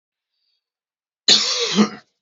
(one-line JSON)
{"cough_length": "2.2 s", "cough_amplitude": 31042, "cough_signal_mean_std_ratio": 0.39, "survey_phase": "beta (2021-08-13 to 2022-03-07)", "age": "45-64", "gender": "Male", "wearing_mask": "No", "symptom_none": true, "symptom_onset": "8 days", "smoker_status": "Ex-smoker", "respiratory_condition_asthma": false, "respiratory_condition_other": false, "recruitment_source": "REACT", "submission_delay": "2 days", "covid_test_result": "Negative", "covid_test_method": "RT-qPCR", "influenza_a_test_result": "Negative", "influenza_b_test_result": "Negative"}